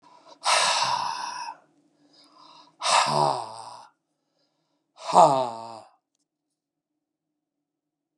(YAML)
exhalation_length: 8.2 s
exhalation_amplitude: 27469
exhalation_signal_mean_std_ratio: 0.37
survey_phase: beta (2021-08-13 to 2022-03-07)
age: 65+
gender: Male
wearing_mask: 'No'
symptom_runny_or_blocked_nose: true
symptom_sore_throat: true
symptom_onset: 7 days
smoker_status: Never smoked
respiratory_condition_asthma: false
respiratory_condition_other: false
recruitment_source: REACT
submission_delay: 1 day
covid_test_result: Negative
covid_test_method: RT-qPCR
influenza_a_test_result: Negative
influenza_b_test_result: Negative